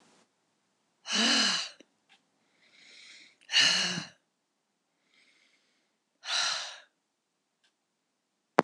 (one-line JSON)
{"exhalation_length": "8.6 s", "exhalation_amplitude": 23113, "exhalation_signal_mean_std_ratio": 0.32, "survey_phase": "beta (2021-08-13 to 2022-03-07)", "age": "65+", "gender": "Female", "wearing_mask": "No", "symptom_runny_or_blocked_nose": true, "symptom_sore_throat": true, "symptom_fatigue": true, "symptom_headache": true, "symptom_other": true, "symptom_onset": "4 days", "smoker_status": "Never smoked", "respiratory_condition_asthma": false, "respiratory_condition_other": false, "recruitment_source": "Test and Trace", "submission_delay": "0 days", "covid_test_result": "Positive", "covid_test_method": "RT-qPCR", "covid_ct_value": 14.3, "covid_ct_gene": "ORF1ab gene", "covid_ct_mean": 14.7, "covid_viral_load": "15000000 copies/ml", "covid_viral_load_category": "High viral load (>1M copies/ml)"}